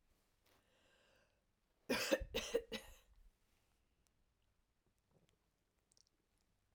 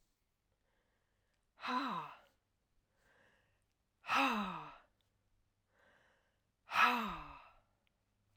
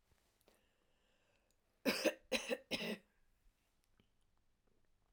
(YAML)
three_cough_length: 6.7 s
three_cough_amplitude: 2692
three_cough_signal_mean_std_ratio: 0.25
exhalation_length: 8.4 s
exhalation_amplitude: 4517
exhalation_signal_mean_std_ratio: 0.32
cough_length: 5.1 s
cough_amplitude: 2986
cough_signal_mean_std_ratio: 0.29
survey_phase: alpha (2021-03-01 to 2021-08-12)
age: 65+
gender: Female
wearing_mask: 'No'
symptom_cough_any: true
symptom_headache: true
symptom_onset: 8 days
smoker_status: Ex-smoker
respiratory_condition_asthma: false
respiratory_condition_other: false
recruitment_source: REACT
submission_delay: 1 day
covid_test_result: Negative
covid_test_method: RT-qPCR